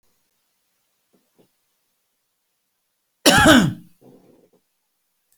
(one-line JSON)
{"three_cough_length": "5.4 s", "three_cough_amplitude": 32126, "three_cough_signal_mean_std_ratio": 0.24, "survey_phase": "beta (2021-08-13 to 2022-03-07)", "age": "65+", "gender": "Male", "wearing_mask": "No", "symptom_cough_any": true, "smoker_status": "Ex-smoker", "respiratory_condition_asthma": false, "respiratory_condition_other": false, "recruitment_source": "REACT", "submission_delay": "1 day", "covid_test_result": "Negative", "covid_test_method": "RT-qPCR"}